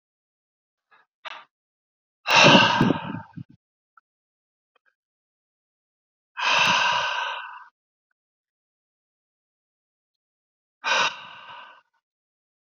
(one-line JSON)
{"exhalation_length": "12.7 s", "exhalation_amplitude": 27441, "exhalation_signal_mean_std_ratio": 0.31, "survey_phase": "beta (2021-08-13 to 2022-03-07)", "age": "18-44", "gender": "Male", "wearing_mask": "No", "symptom_sore_throat": true, "symptom_headache": true, "smoker_status": "Never smoked", "respiratory_condition_asthma": false, "respiratory_condition_other": false, "recruitment_source": "Test and Trace", "submission_delay": "1 day", "covid_test_result": "Positive", "covid_test_method": "RT-qPCR", "covid_ct_value": 13.7, "covid_ct_gene": "ORF1ab gene"}